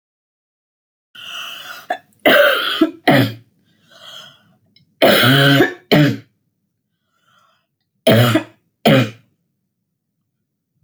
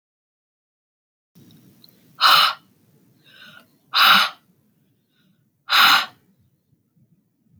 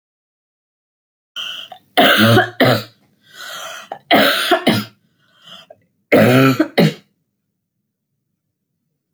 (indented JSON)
{
  "cough_length": "10.8 s",
  "cough_amplitude": 32767,
  "cough_signal_mean_std_ratio": 0.41,
  "exhalation_length": "7.6 s",
  "exhalation_amplitude": 26522,
  "exhalation_signal_mean_std_ratio": 0.3,
  "three_cough_length": "9.1 s",
  "three_cough_amplitude": 29239,
  "three_cough_signal_mean_std_ratio": 0.42,
  "survey_phase": "alpha (2021-03-01 to 2021-08-12)",
  "age": "65+",
  "gender": "Female",
  "wearing_mask": "No",
  "symptom_none": true,
  "smoker_status": "Never smoked",
  "respiratory_condition_asthma": false,
  "respiratory_condition_other": false,
  "recruitment_source": "REACT",
  "submission_delay": "2 days",
  "covid_test_result": "Negative",
  "covid_test_method": "RT-qPCR"
}